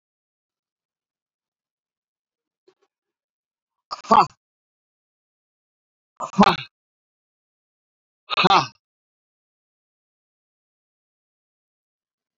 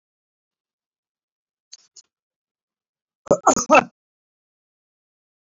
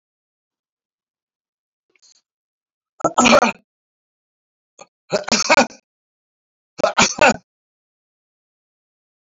{"exhalation_length": "12.4 s", "exhalation_amplitude": 27654, "exhalation_signal_mean_std_ratio": 0.17, "cough_length": "5.5 s", "cough_amplitude": 26439, "cough_signal_mean_std_ratio": 0.18, "three_cough_length": "9.2 s", "three_cough_amplitude": 27806, "three_cough_signal_mean_std_ratio": 0.27, "survey_phase": "beta (2021-08-13 to 2022-03-07)", "age": "65+", "gender": "Male", "wearing_mask": "No", "symptom_none": true, "smoker_status": "Never smoked", "respiratory_condition_asthma": false, "respiratory_condition_other": false, "recruitment_source": "REACT", "submission_delay": "2 days", "covid_test_result": "Negative", "covid_test_method": "RT-qPCR", "influenza_a_test_result": "Negative", "influenza_b_test_result": "Negative"}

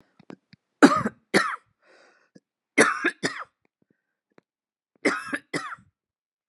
{"three_cough_length": "6.5 s", "three_cough_amplitude": 32504, "three_cough_signal_mean_std_ratio": 0.28, "survey_phase": "beta (2021-08-13 to 2022-03-07)", "age": "45-64", "gender": "Female", "wearing_mask": "No", "symptom_cough_any": true, "symptom_runny_or_blocked_nose": true, "symptom_fatigue": true, "symptom_fever_high_temperature": true, "symptom_headache": true, "symptom_other": true, "smoker_status": "Ex-smoker", "respiratory_condition_asthma": false, "respiratory_condition_other": false, "recruitment_source": "Test and Trace", "submission_delay": "1 day", "covid_test_result": "Positive", "covid_test_method": "RT-qPCR"}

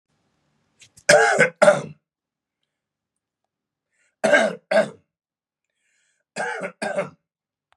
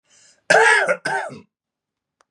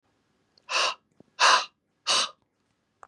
{"three_cough_length": "7.8 s", "three_cough_amplitude": 32707, "three_cough_signal_mean_std_ratio": 0.32, "cough_length": "2.3 s", "cough_amplitude": 29766, "cough_signal_mean_std_ratio": 0.42, "exhalation_length": "3.1 s", "exhalation_amplitude": 16632, "exhalation_signal_mean_std_ratio": 0.36, "survey_phase": "beta (2021-08-13 to 2022-03-07)", "age": "45-64", "gender": "Male", "wearing_mask": "No", "symptom_cough_any": true, "symptom_sore_throat": true, "smoker_status": "Never smoked", "respiratory_condition_asthma": false, "respiratory_condition_other": false, "recruitment_source": "Test and Trace", "submission_delay": "2 days", "covid_test_result": "Positive", "covid_test_method": "RT-qPCR", "covid_ct_value": 31.2, "covid_ct_gene": "N gene"}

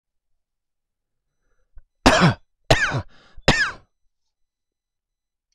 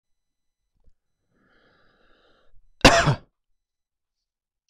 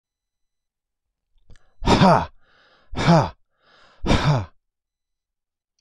{"three_cough_length": "5.5 s", "three_cough_amplitude": 26027, "three_cough_signal_mean_std_ratio": 0.29, "cough_length": "4.7 s", "cough_amplitude": 26028, "cough_signal_mean_std_ratio": 0.19, "exhalation_length": "5.8 s", "exhalation_amplitude": 25232, "exhalation_signal_mean_std_ratio": 0.35, "survey_phase": "beta (2021-08-13 to 2022-03-07)", "age": "45-64", "gender": "Male", "wearing_mask": "No", "symptom_none": true, "smoker_status": "Ex-smoker", "respiratory_condition_asthma": true, "respiratory_condition_other": false, "recruitment_source": "REACT", "submission_delay": "2 days", "covid_test_result": "Negative", "covid_test_method": "RT-qPCR", "influenza_a_test_result": "Negative", "influenza_b_test_result": "Negative"}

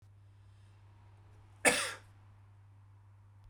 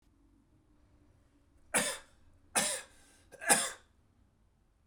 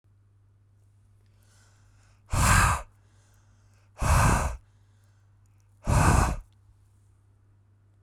{"cough_length": "3.5 s", "cough_amplitude": 10191, "cough_signal_mean_std_ratio": 0.29, "three_cough_length": "4.9 s", "three_cough_amplitude": 13819, "three_cough_signal_mean_std_ratio": 0.31, "exhalation_length": "8.0 s", "exhalation_amplitude": 14947, "exhalation_signal_mean_std_ratio": 0.38, "survey_phase": "beta (2021-08-13 to 2022-03-07)", "age": "18-44", "gender": "Male", "wearing_mask": "No", "symptom_headache": true, "symptom_other": true, "symptom_onset": "7 days", "smoker_status": "Ex-smoker", "respiratory_condition_asthma": false, "respiratory_condition_other": false, "recruitment_source": "Test and Trace", "submission_delay": "1 day", "covid_test_result": "Positive", "covid_test_method": "RT-qPCR", "covid_ct_value": 23.9, "covid_ct_gene": "S gene"}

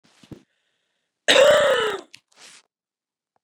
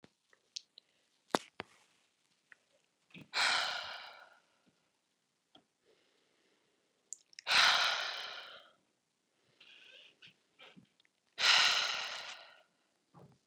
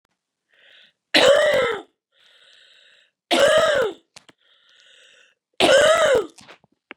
{"cough_length": "3.4 s", "cough_amplitude": 28475, "cough_signal_mean_std_ratio": 0.36, "exhalation_length": "13.5 s", "exhalation_amplitude": 9235, "exhalation_signal_mean_std_ratio": 0.31, "three_cough_length": "7.0 s", "three_cough_amplitude": 25192, "three_cough_signal_mean_std_ratio": 0.44, "survey_phase": "beta (2021-08-13 to 2022-03-07)", "age": "45-64", "gender": "Female", "wearing_mask": "No", "symptom_none": true, "smoker_status": "Never smoked", "respiratory_condition_asthma": false, "respiratory_condition_other": false, "recruitment_source": "REACT", "submission_delay": "2 days", "covid_test_result": "Negative", "covid_test_method": "RT-qPCR", "influenza_a_test_result": "Negative", "influenza_b_test_result": "Negative"}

